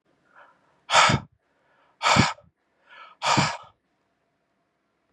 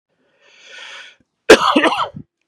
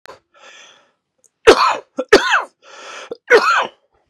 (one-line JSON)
{"exhalation_length": "5.1 s", "exhalation_amplitude": 23799, "exhalation_signal_mean_std_ratio": 0.33, "cough_length": "2.5 s", "cough_amplitude": 32768, "cough_signal_mean_std_ratio": 0.34, "three_cough_length": "4.1 s", "three_cough_amplitude": 32768, "three_cough_signal_mean_std_ratio": 0.38, "survey_phase": "beta (2021-08-13 to 2022-03-07)", "age": "45-64", "gender": "Male", "wearing_mask": "No", "symptom_cough_any": true, "symptom_new_continuous_cough": true, "symptom_runny_or_blocked_nose": true, "symptom_shortness_of_breath": true, "symptom_fatigue": true, "symptom_onset": "5 days", "smoker_status": "Ex-smoker", "respiratory_condition_asthma": false, "respiratory_condition_other": false, "recruitment_source": "Test and Trace", "submission_delay": "1 day", "covid_test_result": "Positive", "covid_test_method": "RT-qPCR"}